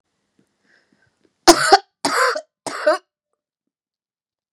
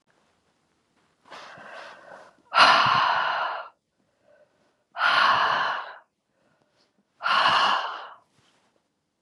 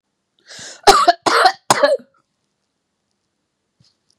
{"three_cough_length": "4.5 s", "three_cough_amplitude": 32768, "three_cough_signal_mean_std_ratio": 0.29, "exhalation_length": "9.2 s", "exhalation_amplitude": 24719, "exhalation_signal_mean_std_ratio": 0.44, "cough_length": "4.2 s", "cough_amplitude": 32768, "cough_signal_mean_std_ratio": 0.33, "survey_phase": "beta (2021-08-13 to 2022-03-07)", "age": "18-44", "gender": "Female", "wearing_mask": "No", "symptom_sore_throat": true, "smoker_status": "Ex-smoker", "respiratory_condition_asthma": false, "respiratory_condition_other": false, "recruitment_source": "REACT", "submission_delay": "2 days", "covid_test_result": "Negative", "covid_test_method": "RT-qPCR", "influenza_a_test_result": "Negative", "influenza_b_test_result": "Negative"}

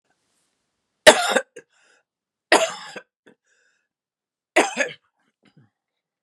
{"three_cough_length": "6.2 s", "three_cough_amplitude": 32768, "three_cough_signal_mean_std_ratio": 0.23, "survey_phase": "beta (2021-08-13 to 2022-03-07)", "age": "65+", "gender": "Female", "wearing_mask": "No", "symptom_cough_any": true, "symptom_runny_or_blocked_nose": true, "symptom_sore_throat": true, "symptom_diarrhoea": true, "symptom_fatigue": true, "symptom_loss_of_taste": true, "symptom_onset": "4 days", "smoker_status": "Ex-smoker", "respiratory_condition_asthma": false, "respiratory_condition_other": true, "recruitment_source": "Test and Trace", "submission_delay": "1 day", "covid_test_result": "Positive", "covid_test_method": "RT-qPCR", "covid_ct_value": 13.8, "covid_ct_gene": "N gene"}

